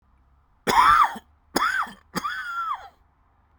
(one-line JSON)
{"three_cough_length": "3.6 s", "three_cough_amplitude": 18975, "three_cough_signal_mean_std_ratio": 0.46, "survey_phase": "beta (2021-08-13 to 2022-03-07)", "age": "18-44", "gender": "Male", "wearing_mask": "No", "symptom_cough_any": true, "symptom_new_continuous_cough": true, "symptom_runny_or_blocked_nose": true, "symptom_shortness_of_breath": true, "symptom_fatigue": true, "symptom_fever_high_temperature": true, "symptom_onset": "3 days", "smoker_status": "Ex-smoker", "respiratory_condition_asthma": false, "respiratory_condition_other": false, "recruitment_source": "Test and Trace", "submission_delay": "2 days", "covid_test_result": "Positive", "covid_test_method": "RT-qPCR", "covid_ct_value": 14.8, "covid_ct_gene": "ORF1ab gene", "covid_ct_mean": 15.9, "covid_viral_load": "6000000 copies/ml", "covid_viral_load_category": "High viral load (>1M copies/ml)"}